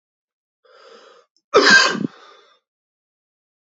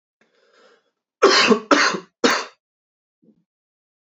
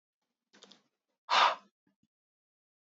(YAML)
cough_length: 3.7 s
cough_amplitude: 31447
cough_signal_mean_std_ratio: 0.29
three_cough_length: 4.2 s
three_cough_amplitude: 28572
three_cough_signal_mean_std_ratio: 0.34
exhalation_length: 3.0 s
exhalation_amplitude: 7807
exhalation_signal_mean_std_ratio: 0.23
survey_phase: beta (2021-08-13 to 2022-03-07)
age: 18-44
gender: Male
wearing_mask: 'No'
symptom_cough_any: true
symptom_new_continuous_cough: true
symptom_runny_or_blocked_nose: true
symptom_abdominal_pain: true
symptom_diarrhoea: true
symptom_fatigue: true
symptom_fever_high_temperature: true
symptom_headache: true
symptom_onset: 3 days
smoker_status: Ex-smoker
respiratory_condition_asthma: true
respiratory_condition_other: false
recruitment_source: Test and Trace
submission_delay: 1 day
covid_test_result: Positive
covid_test_method: RT-qPCR
covid_ct_value: 31.4
covid_ct_gene: N gene